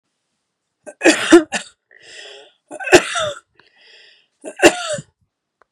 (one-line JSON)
{"three_cough_length": "5.7 s", "three_cough_amplitude": 32768, "three_cough_signal_mean_std_ratio": 0.3, "survey_phase": "beta (2021-08-13 to 2022-03-07)", "age": "45-64", "gender": "Female", "wearing_mask": "No", "symptom_runny_or_blocked_nose": true, "symptom_sore_throat": true, "symptom_fatigue": true, "symptom_headache": true, "symptom_onset": "3 days", "smoker_status": "Never smoked", "respiratory_condition_asthma": false, "respiratory_condition_other": false, "recruitment_source": "Test and Trace", "submission_delay": "2 days", "covid_test_result": "Positive", "covid_test_method": "RT-qPCR", "covid_ct_value": 19.0, "covid_ct_gene": "N gene", "covid_ct_mean": 19.5, "covid_viral_load": "410000 copies/ml", "covid_viral_load_category": "Low viral load (10K-1M copies/ml)"}